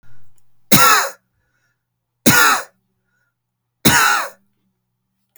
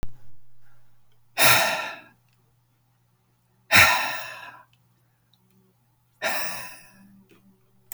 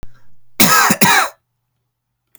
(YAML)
three_cough_length: 5.4 s
three_cough_amplitude: 32768
three_cough_signal_mean_std_ratio: 0.39
exhalation_length: 7.9 s
exhalation_amplitude: 30297
exhalation_signal_mean_std_ratio: 0.36
cough_length: 2.4 s
cough_amplitude: 32768
cough_signal_mean_std_ratio: 0.47
survey_phase: alpha (2021-03-01 to 2021-08-12)
age: 18-44
gender: Male
wearing_mask: 'No'
symptom_none: true
smoker_status: Never smoked
respiratory_condition_asthma: false
respiratory_condition_other: false
recruitment_source: REACT
submission_delay: 1 day
covid_test_result: Negative
covid_test_method: RT-qPCR